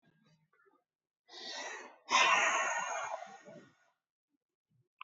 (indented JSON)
{
  "exhalation_length": "5.0 s",
  "exhalation_amplitude": 6267,
  "exhalation_signal_mean_std_ratio": 0.4,
  "survey_phase": "alpha (2021-03-01 to 2021-08-12)",
  "age": "18-44",
  "gender": "Male",
  "wearing_mask": "Yes",
  "symptom_none": true,
  "smoker_status": "Ex-smoker",
  "respiratory_condition_asthma": false,
  "respiratory_condition_other": false,
  "recruitment_source": "REACT",
  "submission_delay": "3 days",
  "covid_test_result": "Negative",
  "covid_test_method": "RT-qPCR"
}